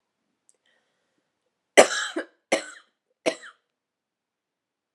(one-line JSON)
{"three_cough_length": "4.9 s", "three_cough_amplitude": 32649, "three_cough_signal_mean_std_ratio": 0.19, "survey_phase": "beta (2021-08-13 to 2022-03-07)", "age": "18-44", "gender": "Female", "wearing_mask": "No", "symptom_cough_any": true, "symptom_new_continuous_cough": true, "symptom_runny_or_blocked_nose": true, "symptom_fatigue": true, "symptom_fever_high_temperature": true, "symptom_headache": true, "symptom_other": true, "symptom_onset": "6 days", "smoker_status": "Never smoked", "respiratory_condition_asthma": true, "respiratory_condition_other": false, "recruitment_source": "Test and Trace", "submission_delay": "2 days", "covid_test_result": "Positive", "covid_test_method": "RT-qPCR", "covid_ct_value": 22.7, "covid_ct_gene": "ORF1ab gene", "covid_ct_mean": 23.0, "covid_viral_load": "28000 copies/ml", "covid_viral_load_category": "Low viral load (10K-1M copies/ml)"}